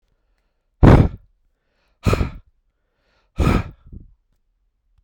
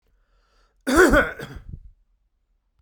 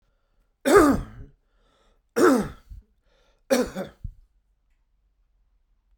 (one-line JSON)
{"exhalation_length": "5.0 s", "exhalation_amplitude": 32768, "exhalation_signal_mean_std_ratio": 0.28, "cough_length": "2.8 s", "cough_amplitude": 24072, "cough_signal_mean_std_ratio": 0.33, "three_cough_length": "6.0 s", "three_cough_amplitude": 19759, "three_cough_signal_mean_std_ratio": 0.32, "survey_phase": "beta (2021-08-13 to 2022-03-07)", "age": "45-64", "gender": "Male", "wearing_mask": "No", "symptom_none": true, "smoker_status": "Ex-smoker", "respiratory_condition_asthma": false, "respiratory_condition_other": false, "recruitment_source": "REACT", "submission_delay": "2 days", "covid_test_result": "Negative", "covid_test_method": "RT-qPCR"}